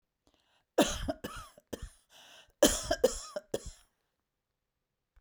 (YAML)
cough_length: 5.2 s
cough_amplitude: 12111
cough_signal_mean_std_ratio: 0.3
survey_phase: beta (2021-08-13 to 2022-03-07)
age: 65+
gender: Female
wearing_mask: 'No'
symptom_none: true
smoker_status: Never smoked
respiratory_condition_asthma: false
respiratory_condition_other: false
recruitment_source: REACT
submission_delay: 1 day
covid_test_result: Negative
covid_test_method: RT-qPCR